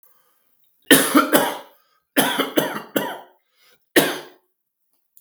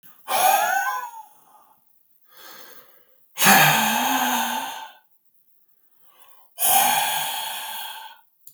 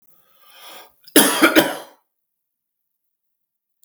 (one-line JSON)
{"three_cough_length": "5.2 s", "three_cough_amplitude": 32768, "three_cough_signal_mean_std_ratio": 0.39, "exhalation_length": "8.5 s", "exhalation_amplitude": 32267, "exhalation_signal_mean_std_ratio": 0.52, "cough_length": "3.8 s", "cough_amplitude": 32768, "cough_signal_mean_std_ratio": 0.29, "survey_phase": "beta (2021-08-13 to 2022-03-07)", "age": "45-64", "gender": "Male", "wearing_mask": "No", "symptom_none": true, "smoker_status": "Ex-smoker", "respiratory_condition_asthma": false, "respiratory_condition_other": false, "recruitment_source": "REACT", "submission_delay": "3 days", "covid_test_result": "Negative", "covid_test_method": "RT-qPCR", "influenza_a_test_result": "Unknown/Void", "influenza_b_test_result": "Unknown/Void"}